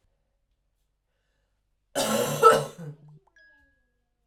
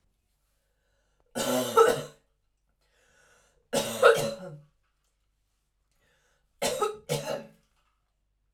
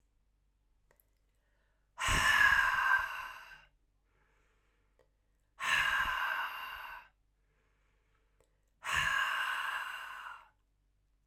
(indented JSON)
{
  "cough_length": "4.3 s",
  "cough_amplitude": 23508,
  "cough_signal_mean_std_ratio": 0.28,
  "three_cough_length": "8.5 s",
  "three_cough_amplitude": 17127,
  "three_cough_signal_mean_std_ratio": 0.32,
  "exhalation_length": "11.3 s",
  "exhalation_amplitude": 5696,
  "exhalation_signal_mean_std_ratio": 0.46,
  "survey_phase": "alpha (2021-03-01 to 2021-08-12)",
  "age": "18-44",
  "gender": "Female",
  "wearing_mask": "No",
  "symptom_cough_any": true,
  "symptom_fatigue": true,
  "symptom_headache": true,
  "smoker_status": "Ex-smoker",
  "respiratory_condition_asthma": false,
  "respiratory_condition_other": false,
  "recruitment_source": "Test and Trace",
  "submission_delay": "2 days",
  "covid_test_result": "Positive",
  "covid_test_method": "RT-qPCR"
}